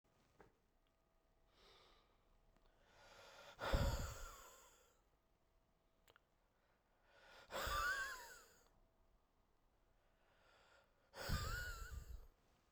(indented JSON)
{
  "exhalation_length": "12.7 s",
  "exhalation_amplitude": 1523,
  "exhalation_signal_mean_std_ratio": 0.38,
  "survey_phase": "beta (2021-08-13 to 2022-03-07)",
  "age": "18-44",
  "gender": "Male",
  "wearing_mask": "No",
  "symptom_cough_any": true,
  "symptom_runny_or_blocked_nose": true,
  "symptom_sore_throat": true,
  "symptom_fatigue": true,
  "symptom_change_to_sense_of_smell_or_taste": true,
  "symptom_loss_of_taste": true,
  "symptom_other": true,
  "smoker_status": "Ex-smoker",
  "respiratory_condition_asthma": false,
  "respiratory_condition_other": false,
  "recruitment_source": "Test and Trace",
  "submission_delay": "2 days",
  "covid_test_result": "Positive",
  "covid_test_method": "LAMP"
}